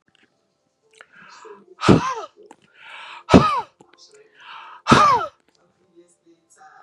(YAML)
exhalation_length: 6.8 s
exhalation_amplitude: 32768
exhalation_signal_mean_std_ratio: 0.31
survey_phase: beta (2021-08-13 to 2022-03-07)
age: 45-64
gender: Male
wearing_mask: 'No'
symptom_none: true
smoker_status: Never smoked
respiratory_condition_asthma: false
respiratory_condition_other: false
recruitment_source: REACT
submission_delay: 1 day
covid_test_result: Negative
covid_test_method: RT-qPCR
influenza_a_test_result: Negative
influenza_b_test_result: Negative